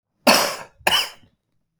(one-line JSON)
{"cough_length": "1.8 s", "cough_amplitude": 30892, "cough_signal_mean_std_ratio": 0.4, "survey_phase": "beta (2021-08-13 to 2022-03-07)", "age": "45-64", "gender": "Male", "wearing_mask": "No", "symptom_cough_any": true, "symptom_runny_or_blocked_nose": true, "symptom_sore_throat": true, "symptom_fatigue": true, "symptom_headache": true, "symptom_change_to_sense_of_smell_or_taste": true, "symptom_other": true, "smoker_status": "Never smoked", "respiratory_condition_asthma": false, "respiratory_condition_other": false, "recruitment_source": "Test and Trace", "submission_delay": "2 days", "covid_test_result": "Positive", "covid_test_method": "RT-qPCR", "covid_ct_value": 24.5, "covid_ct_gene": "ORF1ab gene", "covid_ct_mean": 25.3, "covid_viral_load": "5100 copies/ml", "covid_viral_load_category": "Minimal viral load (< 10K copies/ml)"}